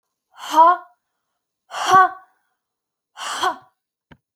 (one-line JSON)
{"exhalation_length": "4.4 s", "exhalation_amplitude": 28929, "exhalation_signal_mean_std_ratio": 0.32, "survey_phase": "beta (2021-08-13 to 2022-03-07)", "age": "18-44", "gender": "Female", "wearing_mask": "No", "symptom_none": true, "smoker_status": "Never smoked", "respiratory_condition_asthma": false, "respiratory_condition_other": false, "recruitment_source": "REACT", "submission_delay": "1 day", "covid_test_result": "Negative", "covid_test_method": "RT-qPCR", "influenza_a_test_result": "Negative", "influenza_b_test_result": "Negative"}